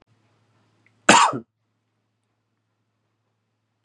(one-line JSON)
{"cough_length": "3.8 s", "cough_amplitude": 32767, "cough_signal_mean_std_ratio": 0.2, "survey_phase": "beta (2021-08-13 to 2022-03-07)", "age": "18-44", "gender": "Male", "wearing_mask": "No", "symptom_abdominal_pain": true, "symptom_fatigue": true, "symptom_onset": "12 days", "smoker_status": "Never smoked", "respiratory_condition_asthma": false, "respiratory_condition_other": false, "recruitment_source": "REACT", "submission_delay": "2 days", "covid_test_result": "Negative", "covid_test_method": "RT-qPCR"}